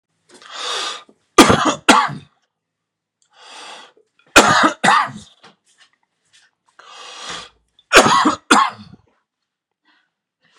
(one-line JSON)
{"three_cough_length": "10.6 s", "three_cough_amplitude": 32768, "three_cough_signal_mean_std_ratio": 0.35, "survey_phase": "beta (2021-08-13 to 2022-03-07)", "age": "18-44", "gender": "Male", "wearing_mask": "No", "symptom_cough_any": true, "symptom_shortness_of_breath": true, "symptom_headache": true, "symptom_onset": "4 days", "smoker_status": "Never smoked", "respiratory_condition_asthma": false, "respiratory_condition_other": false, "recruitment_source": "Test and Trace", "submission_delay": "2 days", "covid_test_result": "Positive", "covid_test_method": "RT-qPCR", "covid_ct_value": 19.4, "covid_ct_gene": "N gene"}